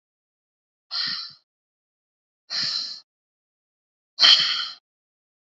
{
  "exhalation_length": "5.5 s",
  "exhalation_amplitude": 26720,
  "exhalation_signal_mean_std_ratio": 0.3,
  "survey_phase": "beta (2021-08-13 to 2022-03-07)",
  "age": "45-64",
  "gender": "Female",
  "wearing_mask": "No",
  "symptom_none": true,
  "smoker_status": "Current smoker (1 to 10 cigarettes per day)",
  "respiratory_condition_asthma": false,
  "respiratory_condition_other": false,
  "recruitment_source": "REACT",
  "submission_delay": "0 days",
  "covid_test_result": "Negative",
  "covid_test_method": "RT-qPCR",
  "influenza_a_test_result": "Unknown/Void",
  "influenza_b_test_result": "Unknown/Void"
}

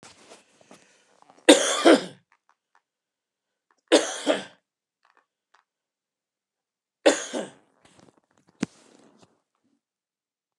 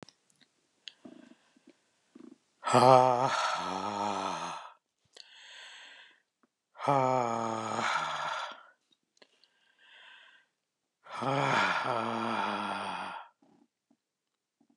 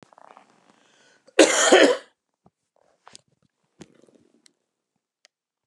{
  "three_cough_length": "10.6 s",
  "three_cough_amplitude": 31650,
  "three_cough_signal_mean_std_ratio": 0.22,
  "exhalation_length": "14.8 s",
  "exhalation_amplitude": 16596,
  "exhalation_signal_mean_std_ratio": 0.42,
  "cough_length": "5.7 s",
  "cough_amplitude": 32767,
  "cough_signal_mean_std_ratio": 0.24,
  "survey_phase": "beta (2021-08-13 to 2022-03-07)",
  "age": "45-64",
  "gender": "Male",
  "wearing_mask": "No",
  "symptom_none": true,
  "smoker_status": "Never smoked",
  "respiratory_condition_asthma": false,
  "respiratory_condition_other": false,
  "recruitment_source": "REACT",
  "submission_delay": "2 days",
  "covid_test_result": "Negative",
  "covid_test_method": "RT-qPCR"
}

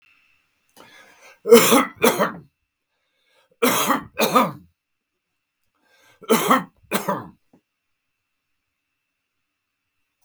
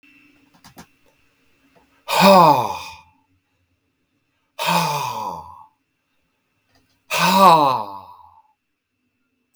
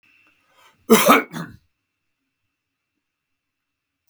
{
  "three_cough_length": "10.2 s",
  "three_cough_amplitude": 32768,
  "three_cough_signal_mean_std_ratio": 0.32,
  "exhalation_length": "9.6 s",
  "exhalation_amplitude": 32767,
  "exhalation_signal_mean_std_ratio": 0.35,
  "cough_length": "4.1 s",
  "cough_amplitude": 32766,
  "cough_signal_mean_std_ratio": 0.23,
  "survey_phase": "beta (2021-08-13 to 2022-03-07)",
  "age": "65+",
  "gender": "Male",
  "wearing_mask": "No",
  "symptom_cough_any": true,
  "symptom_fatigue": true,
  "symptom_onset": "2 days",
  "smoker_status": "Ex-smoker",
  "respiratory_condition_asthma": false,
  "respiratory_condition_other": false,
  "recruitment_source": "Test and Trace",
  "submission_delay": "1 day",
  "covid_test_result": "Negative",
  "covid_test_method": "RT-qPCR"
}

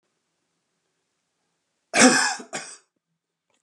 {
  "cough_length": "3.6 s",
  "cough_amplitude": 26108,
  "cough_signal_mean_std_ratio": 0.27,
  "survey_phase": "beta (2021-08-13 to 2022-03-07)",
  "age": "65+",
  "gender": "Male",
  "wearing_mask": "No",
  "symptom_none": true,
  "smoker_status": "Ex-smoker",
  "respiratory_condition_asthma": false,
  "respiratory_condition_other": false,
  "recruitment_source": "REACT",
  "submission_delay": "1 day",
  "covid_test_result": "Negative",
  "covid_test_method": "RT-qPCR"
}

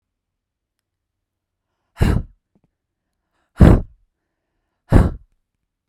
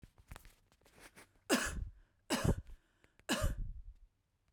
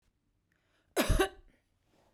{
  "exhalation_length": "5.9 s",
  "exhalation_amplitude": 32768,
  "exhalation_signal_mean_std_ratio": 0.24,
  "three_cough_length": "4.5 s",
  "three_cough_amplitude": 4112,
  "three_cough_signal_mean_std_ratio": 0.41,
  "cough_length": "2.1 s",
  "cough_amplitude": 6470,
  "cough_signal_mean_std_ratio": 0.3,
  "survey_phase": "beta (2021-08-13 to 2022-03-07)",
  "age": "18-44",
  "gender": "Female",
  "wearing_mask": "No",
  "symptom_runny_or_blocked_nose": true,
  "symptom_fatigue": true,
  "symptom_headache": true,
  "symptom_onset": "4 days",
  "smoker_status": "Never smoked",
  "respiratory_condition_asthma": false,
  "respiratory_condition_other": false,
  "recruitment_source": "REACT",
  "submission_delay": "0 days",
  "covid_test_result": "Negative",
  "covid_test_method": "RT-qPCR"
}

